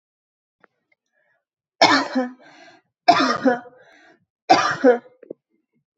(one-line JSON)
{"three_cough_length": "6.0 s", "three_cough_amplitude": 30487, "three_cough_signal_mean_std_ratio": 0.35, "survey_phase": "beta (2021-08-13 to 2022-03-07)", "age": "18-44", "gender": "Female", "wearing_mask": "No", "symptom_runny_or_blocked_nose": true, "symptom_sore_throat": true, "symptom_onset": "4 days", "smoker_status": "Never smoked", "respiratory_condition_asthma": false, "respiratory_condition_other": false, "recruitment_source": "REACT", "submission_delay": "2 days", "covid_test_result": "Negative", "covid_test_method": "RT-qPCR", "influenza_a_test_result": "Negative", "influenza_b_test_result": "Negative"}